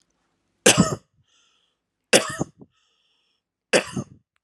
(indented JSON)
{
  "three_cough_length": "4.4 s",
  "three_cough_amplitude": 32767,
  "three_cough_signal_mean_std_ratio": 0.26,
  "survey_phase": "alpha (2021-03-01 to 2021-08-12)",
  "age": "18-44",
  "gender": "Male",
  "wearing_mask": "No",
  "symptom_none": true,
  "symptom_onset": "13 days",
  "smoker_status": "Never smoked",
  "respiratory_condition_asthma": false,
  "respiratory_condition_other": false,
  "recruitment_source": "REACT",
  "submission_delay": "1 day",
  "covid_test_result": "Negative",
  "covid_test_method": "RT-qPCR"
}